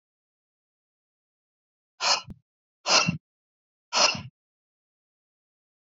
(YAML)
exhalation_length: 5.9 s
exhalation_amplitude: 16709
exhalation_signal_mean_std_ratio: 0.26
survey_phase: beta (2021-08-13 to 2022-03-07)
age: 18-44
gender: Male
wearing_mask: 'No'
symptom_none: true
smoker_status: Never smoked
respiratory_condition_asthma: false
respiratory_condition_other: false
recruitment_source: REACT
submission_delay: 2 days
covid_test_result: Negative
covid_test_method: RT-qPCR